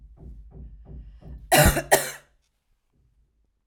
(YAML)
cough_length: 3.7 s
cough_amplitude: 31200
cough_signal_mean_std_ratio: 0.31
survey_phase: alpha (2021-03-01 to 2021-08-12)
age: 18-44
gender: Female
wearing_mask: 'No'
symptom_none: true
smoker_status: Ex-smoker
respiratory_condition_asthma: false
respiratory_condition_other: false
recruitment_source: REACT
submission_delay: 1 day
covid_test_result: Negative
covid_test_method: RT-qPCR